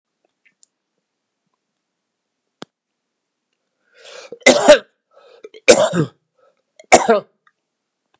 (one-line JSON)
{"three_cough_length": "8.2 s", "three_cough_amplitude": 32768, "three_cough_signal_mean_std_ratio": 0.24, "survey_phase": "beta (2021-08-13 to 2022-03-07)", "age": "65+", "gender": "Male", "wearing_mask": "No", "symptom_cough_any": true, "smoker_status": "Never smoked", "respiratory_condition_asthma": false, "respiratory_condition_other": false, "recruitment_source": "Test and Trace", "submission_delay": "2 days", "covid_test_result": "Positive", "covid_test_method": "RT-qPCR", "covid_ct_value": 16.8, "covid_ct_gene": "ORF1ab gene", "covid_ct_mean": 17.2, "covid_viral_load": "2400000 copies/ml", "covid_viral_load_category": "High viral load (>1M copies/ml)"}